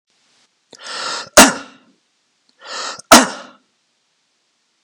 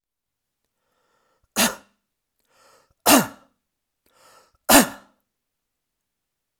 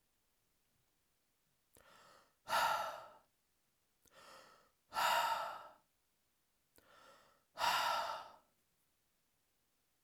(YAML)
cough_length: 4.8 s
cough_amplitude: 32768
cough_signal_mean_std_ratio: 0.25
three_cough_length: 6.6 s
three_cough_amplitude: 32768
three_cough_signal_mean_std_ratio: 0.21
exhalation_length: 10.0 s
exhalation_amplitude: 2573
exhalation_signal_mean_std_ratio: 0.36
survey_phase: alpha (2021-03-01 to 2021-08-12)
age: 45-64
gender: Male
wearing_mask: 'No'
symptom_none: true
smoker_status: Never smoked
respiratory_condition_asthma: false
respiratory_condition_other: false
recruitment_source: REACT
submission_delay: 1 day
covid_test_result: Negative
covid_test_method: RT-qPCR